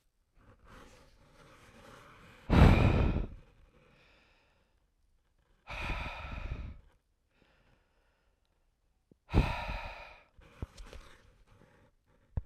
{
  "exhalation_length": "12.5 s",
  "exhalation_amplitude": 12488,
  "exhalation_signal_mean_std_ratio": 0.29,
  "survey_phase": "beta (2021-08-13 to 2022-03-07)",
  "age": "18-44",
  "gender": "Male",
  "wearing_mask": "No",
  "symptom_fatigue": true,
  "symptom_headache": true,
  "symptom_change_to_sense_of_smell_or_taste": true,
  "symptom_other": true,
  "symptom_onset": "2 days",
  "smoker_status": "Never smoked",
  "respiratory_condition_asthma": false,
  "respiratory_condition_other": false,
  "recruitment_source": "Test and Trace",
  "submission_delay": "1 day",
  "covid_test_result": "Positive",
  "covid_test_method": "RT-qPCR",
  "covid_ct_value": 19.4,
  "covid_ct_gene": "ORF1ab gene"
}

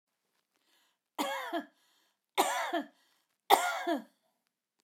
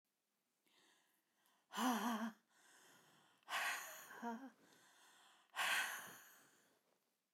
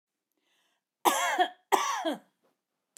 {
  "three_cough_length": "4.8 s",
  "three_cough_amplitude": 15640,
  "three_cough_signal_mean_std_ratio": 0.37,
  "exhalation_length": "7.3 s",
  "exhalation_amplitude": 1594,
  "exhalation_signal_mean_std_ratio": 0.43,
  "cough_length": "3.0 s",
  "cough_amplitude": 14170,
  "cough_signal_mean_std_ratio": 0.41,
  "survey_phase": "beta (2021-08-13 to 2022-03-07)",
  "age": "65+",
  "gender": "Female",
  "wearing_mask": "No",
  "symptom_none": true,
  "smoker_status": "Never smoked",
  "respiratory_condition_asthma": false,
  "respiratory_condition_other": false,
  "recruitment_source": "REACT",
  "submission_delay": "3 days",
  "covid_test_result": "Negative",
  "covid_test_method": "RT-qPCR",
  "influenza_a_test_result": "Negative",
  "influenza_b_test_result": "Negative"
}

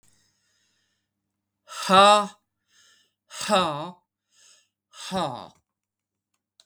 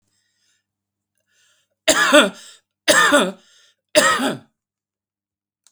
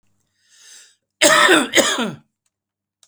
{
  "exhalation_length": "6.7 s",
  "exhalation_amplitude": 22967,
  "exhalation_signal_mean_std_ratio": 0.29,
  "three_cough_length": "5.7 s",
  "three_cough_amplitude": 32768,
  "three_cough_signal_mean_std_ratio": 0.37,
  "cough_length": "3.1 s",
  "cough_amplitude": 32768,
  "cough_signal_mean_std_ratio": 0.41,
  "survey_phase": "beta (2021-08-13 to 2022-03-07)",
  "age": "45-64",
  "gender": "Male",
  "wearing_mask": "No",
  "symptom_none": true,
  "smoker_status": "Never smoked",
  "respiratory_condition_asthma": true,
  "respiratory_condition_other": false,
  "recruitment_source": "REACT",
  "submission_delay": "1 day",
  "covid_test_result": "Negative",
  "covid_test_method": "RT-qPCR",
  "influenza_a_test_result": "Negative",
  "influenza_b_test_result": "Negative"
}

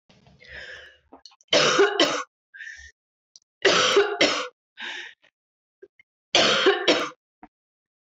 {
  "three_cough_length": "8.0 s",
  "three_cough_amplitude": 20985,
  "three_cough_signal_mean_std_ratio": 0.44,
  "survey_phase": "beta (2021-08-13 to 2022-03-07)",
  "age": "45-64",
  "gender": "Female",
  "wearing_mask": "No",
  "symptom_cough_any": true,
  "symptom_sore_throat": true,
  "symptom_fatigue": true,
  "symptom_headache": true,
  "smoker_status": "Never smoked",
  "respiratory_condition_asthma": false,
  "respiratory_condition_other": false,
  "recruitment_source": "Test and Trace",
  "submission_delay": "10 days",
  "covid_test_result": "Negative",
  "covid_test_method": "RT-qPCR"
}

